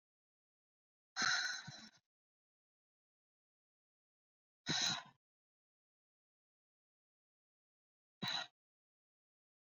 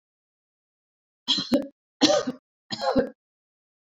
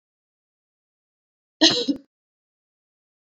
{"exhalation_length": "9.6 s", "exhalation_amplitude": 2377, "exhalation_signal_mean_std_ratio": 0.26, "three_cough_length": "3.8 s", "three_cough_amplitude": 20385, "three_cough_signal_mean_std_ratio": 0.36, "cough_length": "3.2 s", "cough_amplitude": 25349, "cough_signal_mean_std_ratio": 0.21, "survey_phase": "beta (2021-08-13 to 2022-03-07)", "age": "18-44", "gender": "Female", "wearing_mask": "No", "symptom_other": true, "smoker_status": "Never smoked", "respiratory_condition_asthma": false, "respiratory_condition_other": false, "recruitment_source": "REACT", "submission_delay": "1 day", "covid_test_result": "Negative", "covid_test_method": "RT-qPCR"}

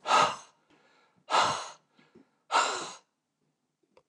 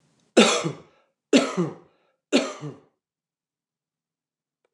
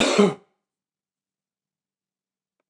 {"exhalation_length": "4.1 s", "exhalation_amplitude": 10291, "exhalation_signal_mean_std_ratio": 0.38, "three_cough_length": "4.7 s", "three_cough_amplitude": 24236, "three_cough_signal_mean_std_ratio": 0.31, "cough_length": "2.7 s", "cough_amplitude": 22144, "cough_signal_mean_std_ratio": 0.26, "survey_phase": "beta (2021-08-13 to 2022-03-07)", "age": "65+", "gender": "Male", "wearing_mask": "No", "symptom_runny_or_blocked_nose": true, "symptom_onset": "12 days", "smoker_status": "Ex-smoker", "respiratory_condition_asthma": false, "respiratory_condition_other": false, "recruitment_source": "REACT", "submission_delay": "2 days", "covid_test_result": "Negative", "covid_test_method": "RT-qPCR", "influenza_a_test_result": "Negative", "influenza_b_test_result": "Negative"}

